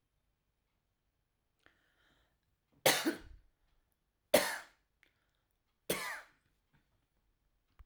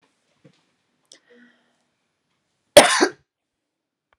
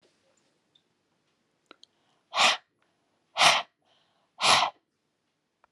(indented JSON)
{
  "three_cough_length": "7.9 s",
  "three_cough_amplitude": 8062,
  "three_cough_signal_mean_std_ratio": 0.22,
  "cough_length": "4.2 s",
  "cough_amplitude": 32768,
  "cough_signal_mean_std_ratio": 0.18,
  "exhalation_length": "5.7 s",
  "exhalation_amplitude": 18458,
  "exhalation_signal_mean_std_ratio": 0.28,
  "survey_phase": "alpha (2021-03-01 to 2021-08-12)",
  "age": "45-64",
  "gender": "Female",
  "wearing_mask": "No",
  "symptom_none": true,
  "smoker_status": "Never smoked",
  "respiratory_condition_asthma": false,
  "respiratory_condition_other": false,
  "recruitment_source": "REACT",
  "submission_delay": "2 days",
  "covid_test_result": "Negative",
  "covid_test_method": "RT-qPCR"
}